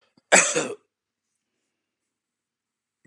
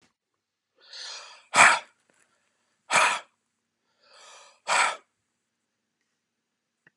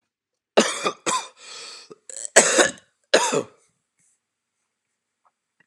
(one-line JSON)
{"cough_length": "3.1 s", "cough_amplitude": 31101, "cough_signal_mean_std_ratio": 0.23, "exhalation_length": "7.0 s", "exhalation_amplitude": 26231, "exhalation_signal_mean_std_ratio": 0.26, "three_cough_length": "5.7 s", "three_cough_amplitude": 32768, "three_cough_signal_mean_std_ratio": 0.32, "survey_phase": "beta (2021-08-13 to 2022-03-07)", "age": "45-64", "gender": "Male", "wearing_mask": "No", "symptom_cough_any": true, "symptom_sore_throat": true, "symptom_fatigue": true, "symptom_fever_high_temperature": true, "symptom_onset": "2 days", "smoker_status": "Never smoked", "respiratory_condition_asthma": false, "respiratory_condition_other": false, "recruitment_source": "Test and Trace", "submission_delay": "1 day", "covid_test_result": "Positive", "covid_test_method": "RT-qPCR", "covid_ct_value": 14.8, "covid_ct_gene": "ORF1ab gene", "covid_ct_mean": 15.0, "covid_viral_load": "12000000 copies/ml", "covid_viral_load_category": "High viral load (>1M copies/ml)"}